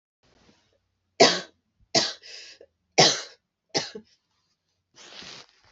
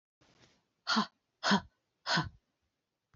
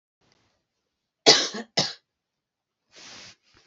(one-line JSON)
{"three_cough_length": "5.7 s", "three_cough_amplitude": 26827, "three_cough_signal_mean_std_ratio": 0.26, "exhalation_length": "3.2 s", "exhalation_amplitude": 6338, "exhalation_signal_mean_std_ratio": 0.33, "cough_length": "3.7 s", "cough_amplitude": 29972, "cough_signal_mean_std_ratio": 0.23, "survey_phase": "beta (2021-08-13 to 2022-03-07)", "age": "45-64", "gender": "Female", "wearing_mask": "No", "symptom_cough_any": true, "symptom_runny_or_blocked_nose": true, "symptom_sore_throat": true, "symptom_diarrhoea": true, "symptom_fatigue": true, "symptom_fever_high_temperature": true, "symptom_headache": true, "symptom_other": true, "symptom_onset": "3 days", "smoker_status": "Never smoked", "respiratory_condition_asthma": false, "respiratory_condition_other": false, "recruitment_source": "Test and Trace", "submission_delay": "2 days", "covid_test_result": "Positive", "covid_test_method": "RT-qPCR", "covid_ct_value": 36.0, "covid_ct_gene": "ORF1ab gene"}